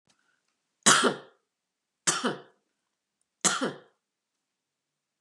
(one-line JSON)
{"three_cough_length": "5.2 s", "three_cough_amplitude": 17645, "three_cough_signal_mean_std_ratio": 0.28, "survey_phase": "beta (2021-08-13 to 2022-03-07)", "age": "65+", "gender": "Female", "wearing_mask": "No", "symptom_sore_throat": true, "smoker_status": "Never smoked", "respiratory_condition_asthma": false, "respiratory_condition_other": false, "recruitment_source": "REACT", "submission_delay": "2 days", "covid_test_result": "Negative", "covid_test_method": "RT-qPCR", "influenza_a_test_result": "Negative", "influenza_b_test_result": "Negative"}